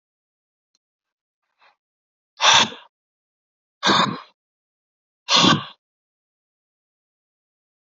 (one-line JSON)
{"exhalation_length": "7.9 s", "exhalation_amplitude": 30941, "exhalation_signal_mean_std_ratio": 0.26, "survey_phase": "alpha (2021-03-01 to 2021-08-12)", "age": "45-64", "gender": "Male", "wearing_mask": "No", "symptom_headache": true, "symptom_onset": "2 days", "smoker_status": "Ex-smoker", "respiratory_condition_asthma": false, "respiratory_condition_other": false, "recruitment_source": "Test and Trace", "submission_delay": "2 days", "covid_test_result": "Positive", "covid_test_method": "RT-qPCR", "covid_ct_value": 14.0, "covid_ct_gene": "ORF1ab gene", "covid_ct_mean": 14.4, "covid_viral_load": "19000000 copies/ml", "covid_viral_load_category": "High viral load (>1M copies/ml)"}